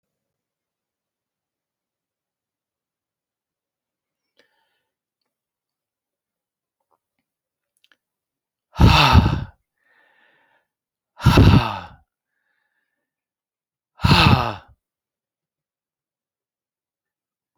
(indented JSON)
{
  "exhalation_length": "17.6 s",
  "exhalation_amplitude": 27835,
  "exhalation_signal_mean_std_ratio": 0.23,
  "survey_phase": "beta (2021-08-13 to 2022-03-07)",
  "age": "65+",
  "gender": "Male",
  "wearing_mask": "No",
  "symptom_none": true,
  "smoker_status": "Ex-smoker",
  "respiratory_condition_asthma": false,
  "respiratory_condition_other": false,
  "recruitment_source": "REACT",
  "submission_delay": "0 days",
  "covid_test_result": "Negative",
  "covid_test_method": "RT-qPCR"
}